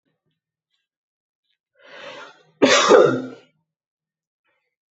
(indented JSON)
{
  "cough_length": "4.9 s",
  "cough_amplitude": 27840,
  "cough_signal_mean_std_ratio": 0.28,
  "survey_phase": "alpha (2021-03-01 to 2021-08-12)",
  "age": "18-44",
  "gender": "Male",
  "wearing_mask": "Yes",
  "symptom_none": true,
  "smoker_status": "Ex-smoker",
  "respiratory_condition_asthma": false,
  "respiratory_condition_other": false,
  "recruitment_source": "REACT",
  "submission_delay": "3 days",
  "covid_test_result": "Negative",
  "covid_test_method": "RT-qPCR"
}